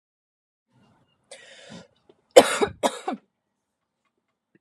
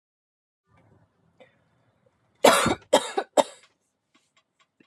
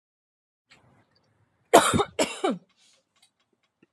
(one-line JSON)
{"three_cough_length": "4.6 s", "three_cough_amplitude": 32768, "three_cough_signal_mean_std_ratio": 0.18, "cough_length": "4.9 s", "cough_amplitude": 26566, "cough_signal_mean_std_ratio": 0.24, "exhalation_length": "3.9 s", "exhalation_amplitude": 31024, "exhalation_signal_mean_std_ratio": 0.26, "survey_phase": "beta (2021-08-13 to 2022-03-07)", "age": "45-64", "gender": "Female", "wearing_mask": "No", "symptom_none": true, "smoker_status": "Never smoked", "respiratory_condition_asthma": false, "respiratory_condition_other": false, "recruitment_source": "REACT", "submission_delay": "2 days", "covid_test_result": "Negative", "covid_test_method": "RT-qPCR"}